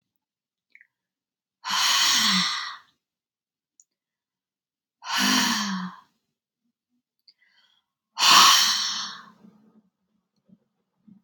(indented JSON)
{
  "exhalation_length": "11.2 s",
  "exhalation_amplitude": 28571,
  "exhalation_signal_mean_std_ratio": 0.37,
  "survey_phase": "beta (2021-08-13 to 2022-03-07)",
  "age": "45-64",
  "gender": "Female",
  "wearing_mask": "No",
  "symptom_sore_throat": true,
  "symptom_headache": true,
  "smoker_status": "Never smoked",
  "respiratory_condition_asthma": false,
  "respiratory_condition_other": false,
  "recruitment_source": "REACT",
  "submission_delay": "1 day",
  "covid_test_result": "Negative",
  "covid_test_method": "RT-qPCR"
}